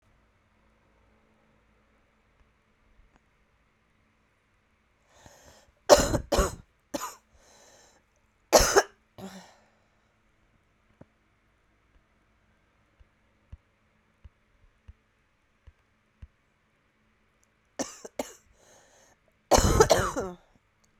{
  "three_cough_length": "21.0 s",
  "three_cough_amplitude": 32767,
  "three_cough_signal_mean_std_ratio": 0.21,
  "survey_phase": "beta (2021-08-13 to 2022-03-07)",
  "age": "18-44",
  "gender": "Female",
  "wearing_mask": "No",
  "symptom_cough_any": true,
  "symptom_runny_or_blocked_nose": true,
  "symptom_abdominal_pain": true,
  "symptom_fatigue": true,
  "symptom_headache": true,
  "symptom_change_to_sense_of_smell_or_taste": true,
  "symptom_loss_of_taste": true,
  "symptom_other": true,
  "symptom_onset": "3 days",
  "smoker_status": "Current smoker (1 to 10 cigarettes per day)",
  "respiratory_condition_asthma": false,
  "respiratory_condition_other": false,
  "recruitment_source": "Test and Trace",
  "submission_delay": "2 days",
  "covid_test_result": "Positive",
  "covid_test_method": "RT-qPCR",
  "covid_ct_value": 19.3,
  "covid_ct_gene": "ORF1ab gene",
  "covid_ct_mean": 19.6,
  "covid_viral_load": "360000 copies/ml",
  "covid_viral_load_category": "Low viral load (10K-1M copies/ml)"
}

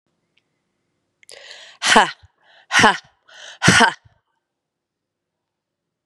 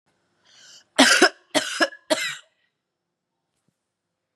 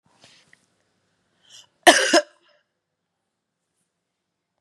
{
  "exhalation_length": "6.1 s",
  "exhalation_amplitude": 32768,
  "exhalation_signal_mean_std_ratio": 0.28,
  "three_cough_length": "4.4 s",
  "three_cough_amplitude": 31603,
  "three_cough_signal_mean_std_ratio": 0.3,
  "cough_length": "4.6 s",
  "cough_amplitude": 32768,
  "cough_signal_mean_std_ratio": 0.19,
  "survey_phase": "beta (2021-08-13 to 2022-03-07)",
  "age": "45-64",
  "gender": "Female",
  "wearing_mask": "No",
  "symptom_runny_or_blocked_nose": true,
  "symptom_sore_throat": true,
  "smoker_status": "Ex-smoker",
  "respiratory_condition_asthma": false,
  "respiratory_condition_other": false,
  "recruitment_source": "Test and Trace",
  "submission_delay": "2 days",
  "covid_test_result": "Positive",
  "covid_test_method": "RT-qPCR",
  "covid_ct_value": 25.8,
  "covid_ct_gene": "N gene"
}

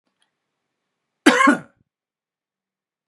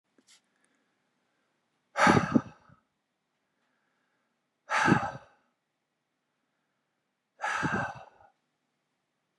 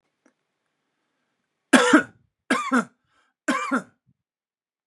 {
  "cough_length": "3.1 s",
  "cough_amplitude": 32767,
  "cough_signal_mean_std_ratio": 0.24,
  "exhalation_length": "9.4 s",
  "exhalation_amplitude": 12591,
  "exhalation_signal_mean_std_ratio": 0.27,
  "three_cough_length": "4.9 s",
  "three_cough_amplitude": 32767,
  "three_cough_signal_mean_std_ratio": 0.3,
  "survey_phase": "beta (2021-08-13 to 2022-03-07)",
  "age": "45-64",
  "gender": "Male",
  "wearing_mask": "No",
  "symptom_none": true,
  "smoker_status": "Never smoked",
  "respiratory_condition_asthma": false,
  "respiratory_condition_other": false,
  "recruitment_source": "REACT",
  "submission_delay": "0 days",
  "covid_test_result": "Negative",
  "covid_test_method": "RT-qPCR",
  "influenza_a_test_result": "Negative",
  "influenza_b_test_result": "Negative"
}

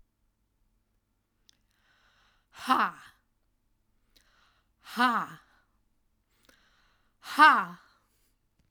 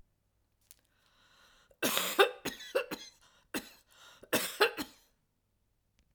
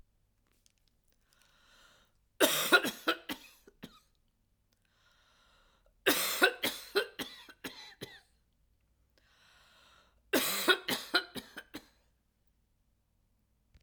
{
  "exhalation_length": "8.7 s",
  "exhalation_amplitude": 18626,
  "exhalation_signal_mean_std_ratio": 0.22,
  "cough_length": "6.1 s",
  "cough_amplitude": 10851,
  "cough_signal_mean_std_ratio": 0.31,
  "three_cough_length": "13.8 s",
  "three_cough_amplitude": 11408,
  "three_cough_signal_mean_std_ratio": 0.3,
  "survey_phase": "alpha (2021-03-01 to 2021-08-12)",
  "age": "65+",
  "gender": "Female",
  "wearing_mask": "No",
  "symptom_none": true,
  "smoker_status": "Never smoked",
  "respiratory_condition_asthma": false,
  "respiratory_condition_other": false,
  "recruitment_source": "REACT",
  "submission_delay": "3 days",
  "covid_test_result": "Negative",
  "covid_test_method": "RT-qPCR"
}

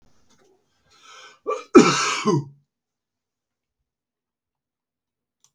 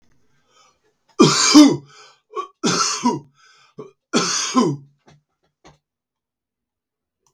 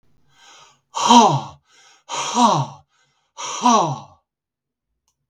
{
  "cough_length": "5.5 s",
  "cough_amplitude": 32768,
  "cough_signal_mean_std_ratio": 0.24,
  "three_cough_length": "7.3 s",
  "three_cough_amplitude": 32768,
  "three_cough_signal_mean_std_ratio": 0.35,
  "exhalation_length": "5.3 s",
  "exhalation_amplitude": 32768,
  "exhalation_signal_mean_std_ratio": 0.39,
  "survey_phase": "beta (2021-08-13 to 2022-03-07)",
  "age": "65+",
  "gender": "Male",
  "wearing_mask": "No",
  "symptom_none": true,
  "smoker_status": "Never smoked",
  "respiratory_condition_asthma": false,
  "respiratory_condition_other": false,
  "recruitment_source": "REACT",
  "submission_delay": "2 days",
  "covid_test_result": "Negative",
  "covid_test_method": "RT-qPCR",
  "influenza_a_test_result": "Negative",
  "influenza_b_test_result": "Negative"
}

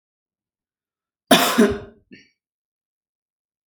{
  "cough_length": "3.7 s",
  "cough_amplitude": 30182,
  "cough_signal_mean_std_ratio": 0.26,
  "survey_phase": "alpha (2021-03-01 to 2021-08-12)",
  "age": "18-44",
  "gender": "Female",
  "wearing_mask": "No",
  "symptom_headache": true,
  "symptom_onset": "12 days",
  "smoker_status": "Ex-smoker",
  "respiratory_condition_asthma": false,
  "respiratory_condition_other": false,
  "recruitment_source": "REACT",
  "submission_delay": "1 day",
  "covid_test_result": "Negative",
  "covid_test_method": "RT-qPCR"
}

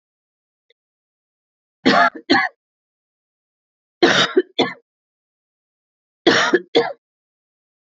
{
  "three_cough_length": "7.9 s",
  "three_cough_amplitude": 28048,
  "three_cough_signal_mean_std_ratio": 0.32,
  "survey_phase": "beta (2021-08-13 to 2022-03-07)",
  "age": "18-44",
  "gender": "Female",
  "wearing_mask": "No",
  "symptom_cough_any": true,
  "symptom_runny_or_blocked_nose": true,
  "symptom_sore_throat": true,
  "smoker_status": "Ex-smoker",
  "respiratory_condition_asthma": true,
  "respiratory_condition_other": false,
  "recruitment_source": "REACT",
  "submission_delay": "6 days",
  "covid_test_result": "Negative",
  "covid_test_method": "RT-qPCR",
  "influenza_a_test_result": "Negative",
  "influenza_b_test_result": "Negative"
}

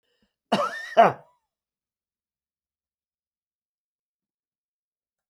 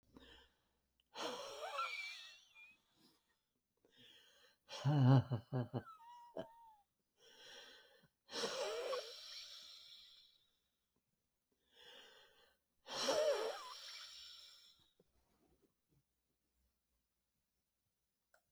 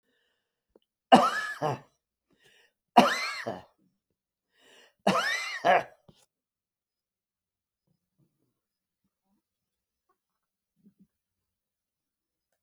{
  "cough_length": "5.3 s",
  "cough_amplitude": 19960,
  "cough_signal_mean_std_ratio": 0.19,
  "exhalation_length": "18.5 s",
  "exhalation_amplitude": 3366,
  "exhalation_signal_mean_std_ratio": 0.33,
  "three_cough_length": "12.6 s",
  "three_cough_amplitude": 24219,
  "three_cough_signal_mean_std_ratio": 0.23,
  "survey_phase": "beta (2021-08-13 to 2022-03-07)",
  "age": "65+",
  "gender": "Male",
  "wearing_mask": "No",
  "symptom_abdominal_pain": true,
  "symptom_diarrhoea": true,
  "smoker_status": "Ex-smoker",
  "respiratory_condition_asthma": false,
  "respiratory_condition_other": false,
  "recruitment_source": "REACT",
  "submission_delay": "1 day",
  "covid_test_result": "Negative",
  "covid_test_method": "RT-qPCR",
  "influenza_a_test_result": "Negative",
  "influenza_b_test_result": "Negative"
}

